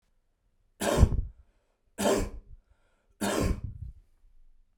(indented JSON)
{
  "three_cough_length": "4.8 s",
  "three_cough_amplitude": 17653,
  "three_cough_signal_mean_std_ratio": 0.39,
  "survey_phase": "beta (2021-08-13 to 2022-03-07)",
  "age": "18-44",
  "gender": "Male",
  "wearing_mask": "No",
  "symptom_none": true,
  "smoker_status": "Never smoked",
  "respiratory_condition_asthma": false,
  "respiratory_condition_other": false,
  "recruitment_source": "REACT",
  "submission_delay": "1 day",
  "covid_test_result": "Negative",
  "covid_test_method": "RT-qPCR",
  "influenza_a_test_result": "Negative",
  "influenza_b_test_result": "Negative"
}